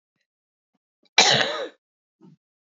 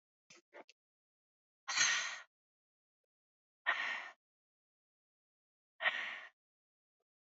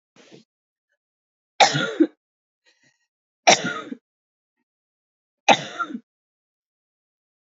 {
  "cough_length": "2.6 s",
  "cough_amplitude": 30870,
  "cough_signal_mean_std_ratio": 0.29,
  "exhalation_length": "7.3 s",
  "exhalation_amplitude": 4126,
  "exhalation_signal_mean_std_ratio": 0.31,
  "three_cough_length": "7.6 s",
  "three_cough_amplitude": 29200,
  "three_cough_signal_mean_std_ratio": 0.23,
  "survey_phase": "beta (2021-08-13 to 2022-03-07)",
  "age": "18-44",
  "gender": "Female",
  "wearing_mask": "No",
  "symptom_new_continuous_cough": true,
  "symptom_runny_or_blocked_nose": true,
  "symptom_abdominal_pain": true,
  "symptom_diarrhoea": true,
  "symptom_fatigue": true,
  "symptom_fever_high_temperature": true,
  "symptom_headache": true,
  "symptom_other": true,
  "smoker_status": "Ex-smoker",
  "respiratory_condition_asthma": false,
  "respiratory_condition_other": false,
  "recruitment_source": "Test and Trace",
  "submission_delay": "2 days",
  "covid_test_result": "Positive",
  "covid_test_method": "RT-qPCR",
  "covid_ct_value": 18.2,
  "covid_ct_gene": "ORF1ab gene",
  "covid_ct_mean": 18.7,
  "covid_viral_load": "730000 copies/ml",
  "covid_viral_load_category": "Low viral load (10K-1M copies/ml)"
}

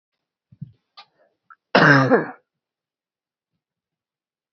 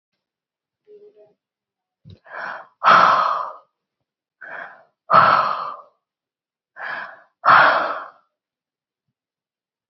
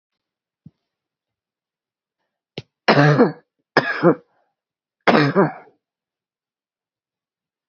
{
  "cough_length": "4.5 s",
  "cough_amplitude": 27751,
  "cough_signal_mean_std_ratio": 0.26,
  "exhalation_length": "9.9 s",
  "exhalation_amplitude": 27988,
  "exhalation_signal_mean_std_ratio": 0.34,
  "three_cough_length": "7.7 s",
  "three_cough_amplitude": 31352,
  "three_cough_signal_mean_std_ratio": 0.29,
  "survey_phase": "beta (2021-08-13 to 2022-03-07)",
  "age": "45-64",
  "gender": "Female",
  "wearing_mask": "No",
  "symptom_none": true,
  "smoker_status": "Never smoked",
  "respiratory_condition_asthma": true,
  "respiratory_condition_other": false,
  "recruitment_source": "REACT",
  "submission_delay": "4 days",
  "covid_test_result": "Negative",
  "covid_test_method": "RT-qPCR"
}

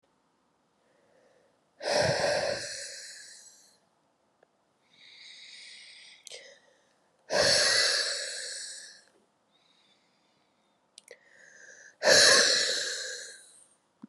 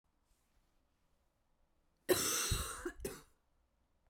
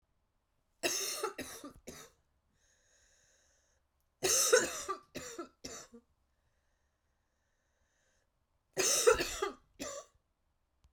{
  "exhalation_length": "14.1 s",
  "exhalation_amplitude": 15255,
  "exhalation_signal_mean_std_ratio": 0.39,
  "cough_length": "4.1 s",
  "cough_amplitude": 3890,
  "cough_signal_mean_std_ratio": 0.36,
  "three_cough_length": "10.9 s",
  "three_cough_amplitude": 7753,
  "three_cough_signal_mean_std_ratio": 0.33,
  "survey_phase": "beta (2021-08-13 to 2022-03-07)",
  "age": "18-44",
  "gender": "Female",
  "wearing_mask": "No",
  "symptom_new_continuous_cough": true,
  "symptom_runny_or_blocked_nose": true,
  "symptom_shortness_of_breath": true,
  "symptom_sore_throat": true,
  "symptom_abdominal_pain": true,
  "symptom_diarrhoea": true,
  "symptom_fatigue": true,
  "symptom_fever_high_temperature": true,
  "symptom_headache": true,
  "symptom_onset": "3 days",
  "smoker_status": "Never smoked",
  "respiratory_condition_asthma": false,
  "respiratory_condition_other": false,
  "recruitment_source": "Test and Trace",
  "submission_delay": "1 day",
  "covid_test_result": "Positive",
  "covid_test_method": "RT-qPCR",
  "covid_ct_value": 27.0,
  "covid_ct_gene": "ORF1ab gene",
  "covid_ct_mean": 29.3,
  "covid_viral_load": "240 copies/ml",
  "covid_viral_load_category": "Minimal viral load (< 10K copies/ml)"
}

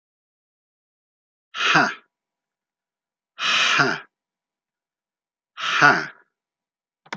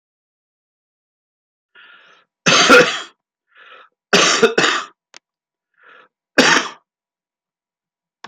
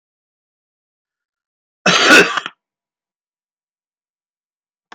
{
  "exhalation_length": "7.2 s",
  "exhalation_amplitude": 32653,
  "exhalation_signal_mean_std_ratio": 0.33,
  "three_cough_length": "8.3 s",
  "three_cough_amplitude": 32277,
  "three_cough_signal_mean_std_ratio": 0.32,
  "cough_length": "4.9 s",
  "cough_amplitude": 32768,
  "cough_signal_mean_std_ratio": 0.25,
  "survey_phase": "beta (2021-08-13 to 2022-03-07)",
  "age": "45-64",
  "gender": "Male",
  "wearing_mask": "No",
  "symptom_cough_any": true,
  "symptom_runny_or_blocked_nose": true,
  "symptom_shortness_of_breath": true,
  "symptom_fatigue": true,
  "symptom_fever_high_temperature": true,
  "symptom_change_to_sense_of_smell_or_taste": true,
  "symptom_other": true,
  "symptom_onset": "2 days",
  "smoker_status": "Never smoked",
  "respiratory_condition_asthma": false,
  "respiratory_condition_other": false,
  "recruitment_source": "Test and Trace",
  "submission_delay": "1 day",
  "covid_test_result": "Positive",
  "covid_test_method": "ePCR"
}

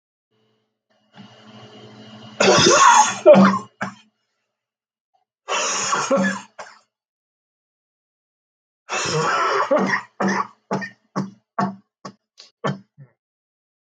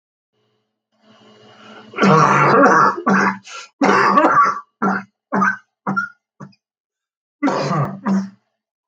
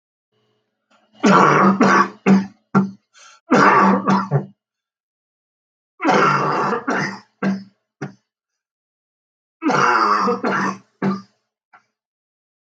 {
  "exhalation_length": "13.8 s",
  "exhalation_amplitude": 32768,
  "exhalation_signal_mean_std_ratio": 0.4,
  "cough_length": "8.9 s",
  "cough_amplitude": 32766,
  "cough_signal_mean_std_ratio": 0.53,
  "three_cough_length": "12.7 s",
  "three_cough_amplitude": 32768,
  "three_cough_signal_mean_std_ratio": 0.49,
  "survey_phase": "beta (2021-08-13 to 2022-03-07)",
  "age": "45-64",
  "gender": "Male",
  "wearing_mask": "No",
  "symptom_new_continuous_cough": true,
  "symptom_headache": true,
  "symptom_onset": "8 days",
  "smoker_status": "Never smoked",
  "respiratory_condition_asthma": false,
  "respiratory_condition_other": false,
  "recruitment_source": "REACT",
  "submission_delay": "2 days",
  "covid_test_result": "Negative",
  "covid_test_method": "RT-qPCR",
  "influenza_a_test_result": "Negative",
  "influenza_b_test_result": "Negative"
}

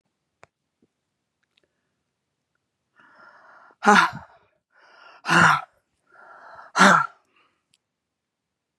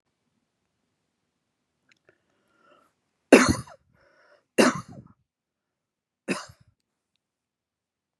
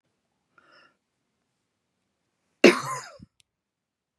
{
  "exhalation_length": "8.8 s",
  "exhalation_amplitude": 30871,
  "exhalation_signal_mean_std_ratio": 0.25,
  "three_cough_length": "8.2 s",
  "three_cough_amplitude": 32730,
  "three_cough_signal_mean_std_ratio": 0.17,
  "cough_length": "4.2 s",
  "cough_amplitude": 29088,
  "cough_signal_mean_std_ratio": 0.16,
  "survey_phase": "beta (2021-08-13 to 2022-03-07)",
  "age": "45-64",
  "gender": "Female",
  "wearing_mask": "No",
  "symptom_runny_or_blocked_nose": true,
  "symptom_sore_throat": true,
  "symptom_fever_high_temperature": true,
  "symptom_headache": true,
  "symptom_change_to_sense_of_smell_or_taste": true,
  "smoker_status": "Never smoked",
  "respiratory_condition_asthma": true,
  "respiratory_condition_other": false,
  "recruitment_source": "Test and Trace",
  "submission_delay": "1 day",
  "covid_test_result": "Positive",
  "covid_test_method": "LFT"
}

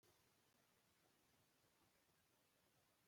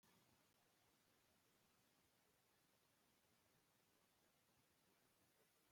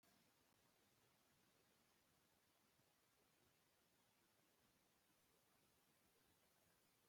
{
  "cough_length": "3.1 s",
  "cough_amplitude": 19,
  "cough_signal_mean_std_ratio": 1.04,
  "three_cough_length": "5.7 s",
  "three_cough_amplitude": 20,
  "three_cough_signal_mean_std_ratio": 1.05,
  "exhalation_length": "7.1 s",
  "exhalation_amplitude": 18,
  "exhalation_signal_mean_std_ratio": 1.05,
  "survey_phase": "beta (2021-08-13 to 2022-03-07)",
  "age": "45-64",
  "gender": "Female",
  "wearing_mask": "No",
  "symptom_none": true,
  "smoker_status": "Ex-smoker",
  "respiratory_condition_asthma": false,
  "respiratory_condition_other": false,
  "recruitment_source": "REACT",
  "submission_delay": "2 days",
  "covid_test_result": "Negative",
  "covid_test_method": "RT-qPCR",
  "influenza_a_test_result": "Negative",
  "influenza_b_test_result": "Negative"
}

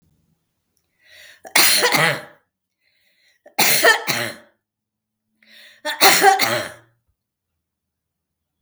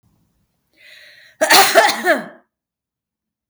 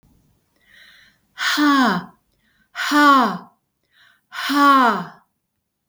{
  "three_cough_length": "8.6 s",
  "three_cough_amplitude": 32768,
  "three_cough_signal_mean_std_ratio": 0.37,
  "cough_length": "3.5 s",
  "cough_amplitude": 32768,
  "cough_signal_mean_std_ratio": 0.36,
  "exhalation_length": "5.9 s",
  "exhalation_amplitude": 25646,
  "exhalation_signal_mean_std_ratio": 0.48,
  "survey_phase": "beta (2021-08-13 to 2022-03-07)",
  "age": "65+",
  "gender": "Female",
  "wearing_mask": "No",
  "symptom_cough_any": true,
  "symptom_fatigue": true,
  "symptom_onset": "12 days",
  "smoker_status": "Never smoked",
  "respiratory_condition_asthma": false,
  "respiratory_condition_other": false,
  "recruitment_source": "REACT",
  "submission_delay": "1 day",
  "covid_test_result": "Negative",
  "covid_test_method": "RT-qPCR",
  "influenza_a_test_result": "Negative",
  "influenza_b_test_result": "Negative"
}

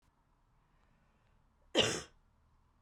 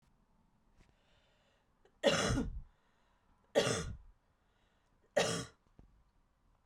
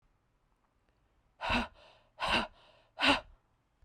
{
  "cough_length": "2.8 s",
  "cough_amplitude": 7092,
  "cough_signal_mean_std_ratio": 0.24,
  "three_cough_length": "6.7 s",
  "three_cough_amplitude": 5006,
  "three_cough_signal_mean_std_ratio": 0.34,
  "exhalation_length": "3.8 s",
  "exhalation_amplitude": 7794,
  "exhalation_signal_mean_std_ratio": 0.34,
  "survey_phase": "beta (2021-08-13 to 2022-03-07)",
  "age": "18-44",
  "gender": "Female",
  "wearing_mask": "No",
  "symptom_headache": true,
  "symptom_other": true,
  "symptom_onset": "4 days",
  "smoker_status": "Never smoked",
  "respiratory_condition_asthma": false,
  "respiratory_condition_other": false,
  "recruitment_source": "Test and Trace",
  "submission_delay": "2 days",
  "covid_test_result": "Positive",
  "covid_test_method": "RT-qPCR",
  "covid_ct_value": 23.5,
  "covid_ct_gene": "ORF1ab gene"
}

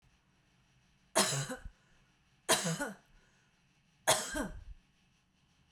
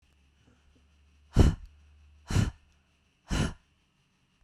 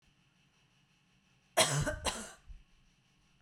{
  "three_cough_length": "5.7 s",
  "three_cough_amplitude": 7484,
  "three_cough_signal_mean_std_ratio": 0.35,
  "exhalation_length": "4.4 s",
  "exhalation_amplitude": 13481,
  "exhalation_signal_mean_std_ratio": 0.28,
  "cough_length": "3.4 s",
  "cough_amplitude": 8261,
  "cough_signal_mean_std_ratio": 0.33,
  "survey_phase": "beta (2021-08-13 to 2022-03-07)",
  "age": "45-64",
  "gender": "Female",
  "wearing_mask": "No",
  "symptom_none": true,
  "smoker_status": "Never smoked",
  "respiratory_condition_asthma": false,
  "respiratory_condition_other": false,
  "recruitment_source": "REACT",
  "submission_delay": "1 day",
  "covid_test_result": "Negative",
  "covid_test_method": "RT-qPCR"
}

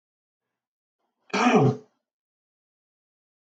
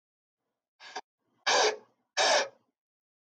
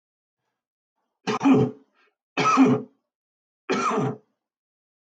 {
  "cough_length": "3.6 s",
  "cough_amplitude": 15202,
  "cough_signal_mean_std_ratio": 0.27,
  "exhalation_length": "3.2 s",
  "exhalation_amplitude": 7538,
  "exhalation_signal_mean_std_ratio": 0.36,
  "three_cough_length": "5.1 s",
  "three_cough_amplitude": 16486,
  "three_cough_signal_mean_std_ratio": 0.4,
  "survey_phase": "beta (2021-08-13 to 2022-03-07)",
  "age": "65+",
  "gender": "Male",
  "wearing_mask": "No",
  "symptom_none": true,
  "smoker_status": "Ex-smoker",
  "respiratory_condition_asthma": false,
  "respiratory_condition_other": false,
  "recruitment_source": "REACT",
  "submission_delay": "2 days",
  "covid_test_result": "Negative",
  "covid_test_method": "RT-qPCR",
  "influenza_a_test_result": "Negative",
  "influenza_b_test_result": "Negative"
}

